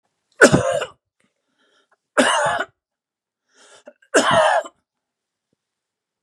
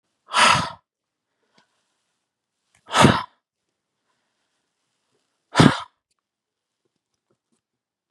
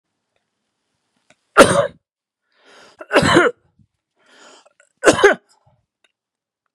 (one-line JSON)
{"three_cough_length": "6.2 s", "three_cough_amplitude": 32768, "three_cough_signal_mean_std_ratio": 0.35, "exhalation_length": "8.1 s", "exhalation_amplitude": 32768, "exhalation_signal_mean_std_ratio": 0.23, "cough_length": "6.7 s", "cough_amplitude": 32768, "cough_signal_mean_std_ratio": 0.28, "survey_phase": "beta (2021-08-13 to 2022-03-07)", "age": "65+", "gender": "Male", "wearing_mask": "No", "symptom_none": true, "smoker_status": "Never smoked", "respiratory_condition_asthma": true, "respiratory_condition_other": false, "recruitment_source": "Test and Trace", "submission_delay": "1 day", "covid_test_result": "Negative", "covid_test_method": "RT-qPCR"}